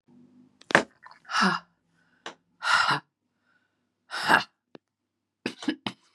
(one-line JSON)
{"exhalation_length": "6.1 s", "exhalation_amplitude": 32532, "exhalation_signal_mean_std_ratio": 0.33, "survey_phase": "beta (2021-08-13 to 2022-03-07)", "age": "45-64", "gender": "Female", "wearing_mask": "No", "symptom_cough_any": true, "symptom_runny_or_blocked_nose": true, "symptom_shortness_of_breath": true, "symptom_sore_throat": true, "symptom_fatigue": true, "symptom_headache": true, "symptom_onset": "3 days", "smoker_status": "Never smoked", "respiratory_condition_asthma": false, "respiratory_condition_other": false, "recruitment_source": "Test and Trace", "submission_delay": "2 days", "covid_test_result": "Positive", "covid_test_method": "RT-qPCR", "covid_ct_value": 24.5, "covid_ct_gene": "N gene"}